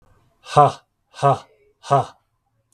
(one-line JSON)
{"exhalation_length": "2.7 s", "exhalation_amplitude": 32768, "exhalation_signal_mean_std_ratio": 0.32, "survey_phase": "beta (2021-08-13 to 2022-03-07)", "age": "45-64", "gender": "Male", "wearing_mask": "No", "symptom_none": true, "smoker_status": "Never smoked", "respiratory_condition_asthma": false, "respiratory_condition_other": false, "recruitment_source": "REACT", "submission_delay": "2 days", "covid_test_result": "Negative", "covid_test_method": "RT-qPCR", "influenza_a_test_result": "Negative", "influenza_b_test_result": "Negative"}